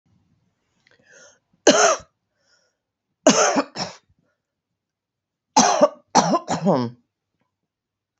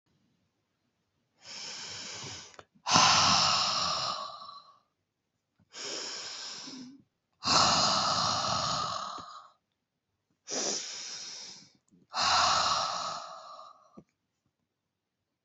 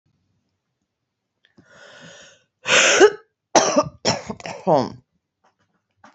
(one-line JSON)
{"three_cough_length": "8.2 s", "three_cough_amplitude": 30163, "three_cough_signal_mean_std_ratio": 0.34, "exhalation_length": "15.4 s", "exhalation_amplitude": 16010, "exhalation_signal_mean_std_ratio": 0.5, "cough_length": "6.1 s", "cough_amplitude": 28351, "cough_signal_mean_std_ratio": 0.33, "survey_phase": "beta (2021-08-13 to 2022-03-07)", "age": "45-64", "gender": "Female", "wearing_mask": "No", "symptom_none": true, "smoker_status": "Current smoker (11 or more cigarettes per day)", "respiratory_condition_asthma": false, "respiratory_condition_other": false, "recruitment_source": "REACT", "submission_delay": "1 day", "covid_test_result": "Negative", "covid_test_method": "RT-qPCR", "influenza_a_test_result": "Negative", "influenza_b_test_result": "Negative"}